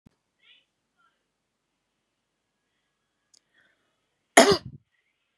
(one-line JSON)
{"cough_length": "5.4 s", "cough_amplitude": 32768, "cough_signal_mean_std_ratio": 0.14, "survey_phase": "beta (2021-08-13 to 2022-03-07)", "age": "18-44", "gender": "Female", "wearing_mask": "No", "symptom_runny_or_blocked_nose": true, "symptom_headache": true, "symptom_onset": "3 days", "smoker_status": "Never smoked", "respiratory_condition_asthma": true, "respiratory_condition_other": false, "recruitment_source": "REACT", "submission_delay": "1 day", "covid_test_result": "Positive", "covid_test_method": "RT-qPCR", "covid_ct_value": 18.0, "covid_ct_gene": "E gene", "influenza_a_test_result": "Negative", "influenza_b_test_result": "Negative"}